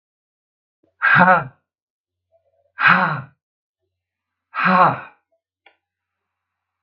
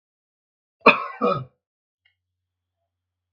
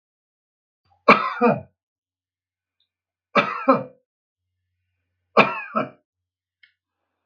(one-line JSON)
{"exhalation_length": "6.8 s", "exhalation_amplitude": 32767, "exhalation_signal_mean_std_ratio": 0.33, "cough_length": "3.3 s", "cough_amplitude": 32767, "cough_signal_mean_std_ratio": 0.22, "three_cough_length": "7.3 s", "three_cough_amplitude": 32767, "three_cough_signal_mean_std_ratio": 0.27, "survey_phase": "beta (2021-08-13 to 2022-03-07)", "age": "65+", "gender": "Male", "wearing_mask": "No", "symptom_none": true, "smoker_status": "Never smoked", "respiratory_condition_asthma": false, "respiratory_condition_other": false, "recruitment_source": "REACT", "submission_delay": "9 days", "covid_test_result": "Negative", "covid_test_method": "RT-qPCR", "influenza_a_test_result": "Negative", "influenza_b_test_result": "Negative"}